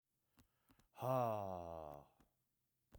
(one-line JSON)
{"exhalation_length": "3.0 s", "exhalation_amplitude": 1590, "exhalation_signal_mean_std_ratio": 0.41, "survey_phase": "beta (2021-08-13 to 2022-03-07)", "age": "45-64", "gender": "Male", "wearing_mask": "No", "symptom_none": true, "smoker_status": "Never smoked", "respiratory_condition_asthma": false, "respiratory_condition_other": false, "recruitment_source": "REACT", "submission_delay": "3 days", "covid_test_result": "Negative", "covid_test_method": "RT-qPCR", "influenza_a_test_result": "Unknown/Void", "influenza_b_test_result": "Unknown/Void"}